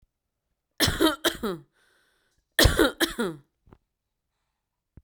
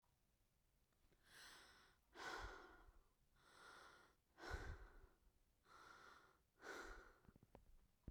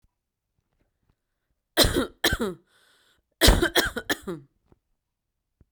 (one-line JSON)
{"cough_length": "5.0 s", "cough_amplitude": 19810, "cough_signal_mean_std_ratio": 0.34, "exhalation_length": "8.1 s", "exhalation_amplitude": 392, "exhalation_signal_mean_std_ratio": 0.55, "three_cough_length": "5.7 s", "three_cough_amplitude": 25688, "three_cough_signal_mean_std_ratio": 0.32, "survey_phase": "beta (2021-08-13 to 2022-03-07)", "age": "18-44", "gender": "Female", "wearing_mask": "No", "symptom_none": true, "smoker_status": "Current smoker (1 to 10 cigarettes per day)", "respiratory_condition_asthma": false, "respiratory_condition_other": false, "recruitment_source": "REACT", "submission_delay": "3 days", "covid_test_result": "Negative", "covid_test_method": "RT-qPCR", "influenza_a_test_result": "Unknown/Void", "influenza_b_test_result": "Unknown/Void"}